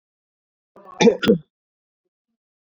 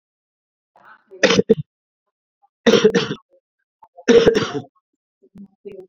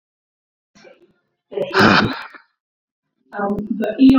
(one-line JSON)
{"cough_length": "2.6 s", "cough_amplitude": 23963, "cough_signal_mean_std_ratio": 0.26, "three_cough_length": "5.9 s", "three_cough_amplitude": 32768, "three_cough_signal_mean_std_ratio": 0.33, "exhalation_length": "4.2 s", "exhalation_amplitude": 31912, "exhalation_signal_mean_std_ratio": 0.42, "survey_phase": "beta (2021-08-13 to 2022-03-07)", "age": "45-64", "gender": "Male", "wearing_mask": "No", "symptom_runny_or_blocked_nose": true, "symptom_sore_throat": true, "symptom_fatigue": true, "symptom_headache": true, "smoker_status": "Never smoked", "respiratory_condition_asthma": false, "respiratory_condition_other": false, "recruitment_source": "Test and Trace", "submission_delay": "1 day", "covid_test_result": "Positive", "covid_test_method": "RT-qPCR", "covid_ct_value": 16.1, "covid_ct_gene": "ORF1ab gene", "covid_ct_mean": 16.6, "covid_viral_load": "3700000 copies/ml", "covid_viral_load_category": "High viral load (>1M copies/ml)"}